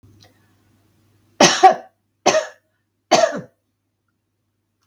three_cough_length: 4.9 s
three_cough_amplitude: 32768
three_cough_signal_mean_std_ratio: 0.29
survey_phase: beta (2021-08-13 to 2022-03-07)
age: 45-64
gender: Female
wearing_mask: 'No'
symptom_none: true
smoker_status: Never smoked
respiratory_condition_asthma: false
respiratory_condition_other: false
recruitment_source: REACT
submission_delay: 1 day
covid_test_result: Negative
covid_test_method: RT-qPCR
influenza_a_test_result: Unknown/Void
influenza_b_test_result: Unknown/Void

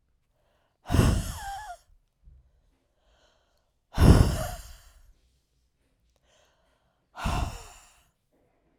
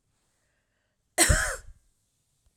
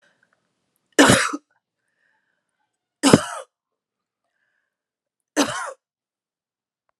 exhalation_length: 8.8 s
exhalation_amplitude: 24123
exhalation_signal_mean_std_ratio: 0.28
cough_length: 2.6 s
cough_amplitude: 16593
cough_signal_mean_std_ratio: 0.29
three_cough_length: 7.0 s
three_cough_amplitude: 32768
three_cough_signal_mean_std_ratio: 0.23
survey_phase: alpha (2021-03-01 to 2021-08-12)
age: 18-44
gender: Female
wearing_mask: 'No'
symptom_cough_any: true
symptom_fatigue: true
symptom_headache: true
smoker_status: Ex-smoker
respiratory_condition_asthma: false
respiratory_condition_other: false
recruitment_source: Test and Trace
submission_delay: 4 days
covid_test_result: Positive
covid_test_method: RT-qPCR
covid_ct_value: 16.9
covid_ct_gene: ORF1ab gene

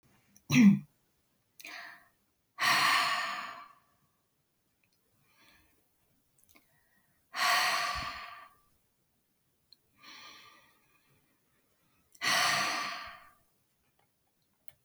exhalation_length: 14.8 s
exhalation_amplitude: 7751
exhalation_signal_mean_std_ratio: 0.33
survey_phase: alpha (2021-03-01 to 2021-08-12)
age: 45-64
gender: Female
wearing_mask: 'No'
symptom_none: true
smoker_status: Ex-smoker
respiratory_condition_asthma: false
respiratory_condition_other: false
recruitment_source: REACT
submission_delay: 3 days
covid_test_result: Negative
covid_test_method: RT-qPCR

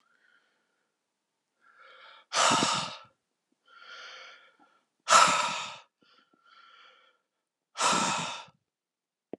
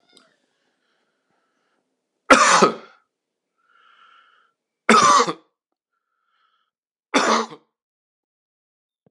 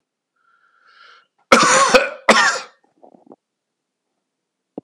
exhalation_length: 9.4 s
exhalation_amplitude: 15474
exhalation_signal_mean_std_ratio: 0.33
three_cough_length: 9.1 s
three_cough_amplitude: 32767
three_cough_signal_mean_std_ratio: 0.27
cough_length: 4.8 s
cough_amplitude: 32768
cough_signal_mean_std_ratio: 0.33
survey_phase: beta (2021-08-13 to 2022-03-07)
age: 45-64
gender: Male
wearing_mask: 'No'
symptom_none: true
smoker_status: Ex-smoker
respiratory_condition_asthma: false
respiratory_condition_other: false
recruitment_source: REACT
submission_delay: 2 days
covid_test_result: Negative
covid_test_method: RT-qPCR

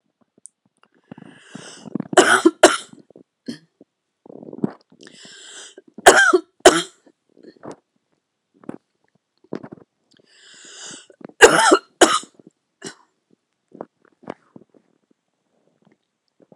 three_cough_length: 16.6 s
three_cough_amplitude: 32768
three_cough_signal_mean_std_ratio: 0.24
survey_phase: beta (2021-08-13 to 2022-03-07)
age: 45-64
gender: Female
wearing_mask: 'No'
symptom_new_continuous_cough: true
symptom_runny_or_blocked_nose: true
symptom_sore_throat: true
symptom_diarrhoea: true
symptom_fatigue: true
symptom_fever_high_temperature: true
symptom_headache: true
symptom_onset: 8 days
smoker_status: Never smoked
respiratory_condition_asthma: false
respiratory_condition_other: false
recruitment_source: Test and Trace
submission_delay: 2 days
covid_test_result: Negative
covid_test_method: RT-qPCR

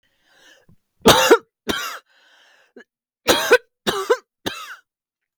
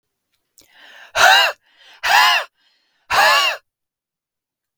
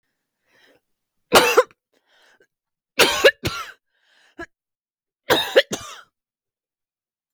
cough_length: 5.4 s
cough_amplitude: 32768
cough_signal_mean_std_ratio: 0.33
exhalation_length: 4.8 s
exhalation_amplitude: 32768
exhalation_signal_mean_std_ratio: 0.42
three_cough_length: 7.3 s
three_cough_amplitude: 32768
three_cough_signal_mean_std_ratio: 0.27
survey_phase: beta (2021-08-13 to 2022-03-07)
age: 45-64
gender: Female
wearing_mask: 'No'
symptom_none: true
smoker_status: Ex-smoker
respiratory_condition_asthma: false
respiratory_condition_other: false
recruitment_source: REACT
submission_delay: 11 days
covid_test_result: Negative
covid_test_method: RT-qPCR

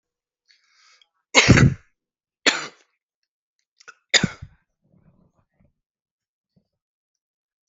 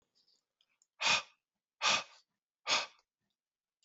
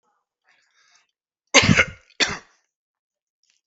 three_cough_length: 7.7 s
three_cough_amplitude: 32768
three_cough_signal_mean_std_ratio: 0.21
exhalation_length: 3.8 s
exhalation_amplitude: 4918
exhalation_signal_mean_std_ratio: 0.31
cough_length: 3.7 s
cough_amplitude: 32768
cough_signal_mean_std_ratio: 0.25
survey_phase: beta (2021-08-13 to 2022-03-07)
age: 45-64
gender: Male
wearing_mask: 'No'
symptom_runny_or_blocked_nose: true
symptom_sore_throat: true
symptom_onset: 2 days
smoker_status: Current smoker (11 or more cigarettes per day)
respiratory_condition_asthma: false
respiratory_condition_other: false
recruitment_source: Test and Trace
submission_delay: 2 days
covid_test_result: Positive
covid_test_method: RT-qPCR
covid_ct_value: 20.3
covid_ct_gene: ORF1ab gene
covid_ct_mean: 23.1
covid_viral_load: 26000 copies/ml
covid_viral_load_category: Low viral load (10K-1M copies/ml)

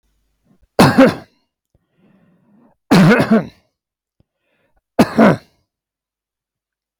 three_cough_length: 7.0 s
three_cough_amplitude: 32768
three_cough_signal_mean_std_ratio: 0.33
survey_phase: beta (2021-08-13 to 2022-03-07)
age: 65+
gender: Male
wearing_mask: 'No'
symptom_none: true
smoker_status: Never smoked
respiratory_condition_asthma: false
respiratory_condition_other: false
recruitment_source: REACT
submission_delay: 2 days
covid_test_result: Negative
covid_test_method: RT-qPCR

